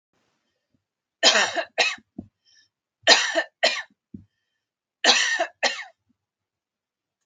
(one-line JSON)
{"three_cough_length": "7.3 s", "three_cough_amplitude": 31382, "three_cough_signal_mean_std_ratio": 0.35, "survey_phase": "beta (2021-08-13 to 2022-03-07)", "age": "18-44", "gender": "Female", "wearing_mask": "No", "symptom_none": true, "smoker_status": "Never smoked", "respiratory_condition_asthma": false, "respiratory_condition_other": false, "recruitment_source": "REACT", "submission_delay": "1 day", "covid_test_result": "Negative", "covid_test_method": "RT-qPCR", "influenza_a_test_result": "Negative", "influenza_b_test_result": "Negative"}